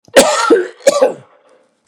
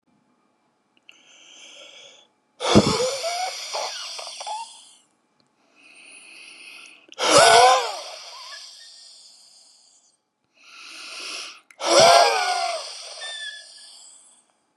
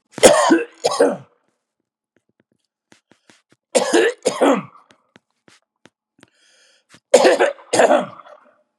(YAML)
cough_length: 1.9 s
cough_amplitude: 32768
cough_signal_mean_std_ratio: 0.53
exhalation_length: 14.8 s
exhalation_amplitude: 29477
exhalation_signal_mean_std_ratio: 0.38
three_cough_length: 8.8 s
three_cough_amplitude: 32768
three_cough_signal_mean_std_ratio: 0.38
survey_phase: beta (2021-08-13 to 2022-03-07)
age: 65+
gender: Male
wearing_mask: 'No'
symptom_none: true
smoker_status: Ex-smoker
respiratory_condition_asthma: true
respiratory_condition_other: false
recruitment_source: REACT
submission_delay: 2 days
covid_test_result: Negative
covid_test_method: RT-qPCR
influenza_a_test_result: Negative
influenza_b_test_result: Negative